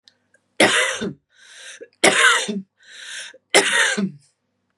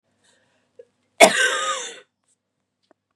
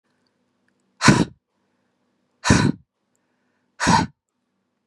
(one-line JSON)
{"three_cough_length": "4.8 s", "three_cough_amplitude": 32767, "three_cough_signal_mean_std_ratio": 0.47, "cough_length": "3.2 s", "cough_amplitude": 32768, "cough_signal_mean_std_ratio": 0.28, "exhalation_length": "4.9 s", "exhalation_amplitude": 32768, "exhalation_signal_mean_std_ratio": 0.3, "survey_phase": "beta (2021-08-13 to 2022-03-07)", "age": "45-64", "gender": "Female", "wearing_mask": "No", "symptom_none": true, "smoker_status": "Ex-smoker", "respiratory_condition_asthma": false, "respiratory_condition_other": false, "recruitment_source": "REACT", "submission_delay": "0 days", "covid_test_result": "Negative", "covid_test_method": "RT-qPCR"}